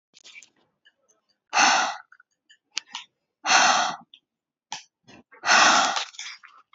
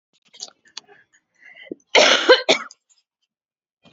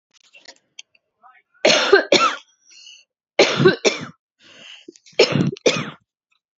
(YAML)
exhalation_length: 6.7 s
exhalation_amplitude: 21340
exhalation_signal_mean_std_ratio: 0.39
cough_length: 3.9 s
cough_amplitude: 30934
cough_signal_mean_std_ratio: 0.29
three_cough_length: 6.6 s
three_cough_amplitude: 32218
three_cough_signal_mean_std_ratio: 0.38
survey_phase: beta (2021-08-13 to 2022-03-07)
age: 18-44
gender: Female
wearing_mask: 'No'
symptom_none: true
symptom_onset: 13 days
smoker_status: Current smoker (e-cigarettes or vapes only)
respiratory_condition_asthma: false
respiratory_condition_other: false
recruitment_source: REACT
submission_delay: 2 days
covid_test_result: Negative
covid_test_method: RT-qPCR
influenza_a_test_result: Negative
influenza_b_test_result: Negative